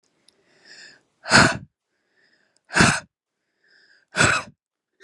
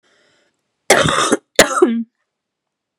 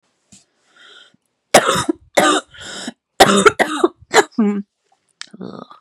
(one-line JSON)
{"exhalation_length": "5.0 s", "exhalation_amplitude": 29302, "exhalation_signal_mean_std_ratio": 0.3, "cough_length": "3.0 s", "cough_amplitude": 32768, "cough_signal_mean_std_ratio": 0.4, "three_cough_length": "5.8 s", "three_cough_amplitude": 32768, "three_cough_signal_mean_std_ratio": 0.39, "survey_phase": "beta (2021-08-13 to 2022-03-07)", "age": "18-44", "gender": "Female", "wearing_mask": "No", "symptom_cough_any": true, "symptom_runny_or_blocked_nose": true, "symptom_sore_throat": true, "symptom_onset": "4 days", "smoker_status": "Never smoked", "respiratory_condition_asthma": false, "respiratory_condition_other": false, "recruitment_source": "Test and Trace", "submission_delay": "2 days", "covid_test_result": "Positive", "covid_test_method": "RT-qPCR", "covid_ct_value": 26.7, "covid_ct_gene": "N gene", "covid_ct_mean": 26.7, "covid_viral_load": "1700 copies/ml", "covid_viral_load_category": "Minimal viral load (< 10K copies/ml)"}